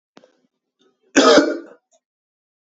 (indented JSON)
{
  "cough_length": "2.6 s",
  "cough_amplitude": 29698,
  "cough_signal_mean_std_ratio": 0.31,
  "survey_phase": "beta (2021-08-13 to 2022-03-07)",
  "age": "18-44",
  "gender": "Male",
  "wearing_mask": "No",
  "symptom_cough_any": true,
  "symptom_runny_or_blocked_nose": true,
  "symptom_sore_throat": true,
  "symptom_diarrhoea": true,
  "symptom_fatigue": true,
  "symptom_headache": true,
  "symptom_loss_of_taste": true,
  "symptom_onset": "4 days",
  "smoker_status": "Never smoked",
  "respiratory_condition_asthma": false,
  "respiratory_condition_other": false,
  "recruitment_source": "Test and Trace",
  "submission_delay": "1 day",
  "covid_test_result": "Positive",
  "covid_test_method": "RT-qPCR",
  "covid_ct_value": 23.9,
  "covid_ct_gene": "ORF1ab gene"
}